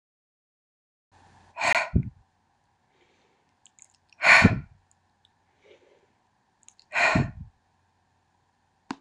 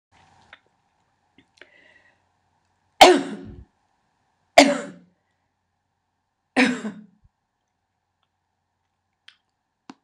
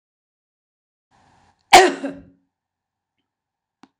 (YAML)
exhalation_length: 9.0 s
exhalation_amplitude: 22966
exhalation_signal_mean_std_ratio: 0.26
three_cough_length: 10.0 s
three_cough_amplitude: 26028
three_cough_signal_mean_std_ratio: 0.19
cough_length: 4.0 s
cough_amplitude: 26028
cough_signal_mean_std_ratio: 0.19
survey_phase: alpha (2021-03-01 to 2021-08-12)
age: 65+
gender: Female
wearing_mask: 'No'
symptom_none: true
smoker_status: Current smoker (1 to 10 cigarettes per day)
respiratory_condition_asthma: false
respiratory_condition_other: false
recruitment_source: REACT
submission_delay: 1 day
covid_test_result: Negative
covid_test_method: RT-qPCR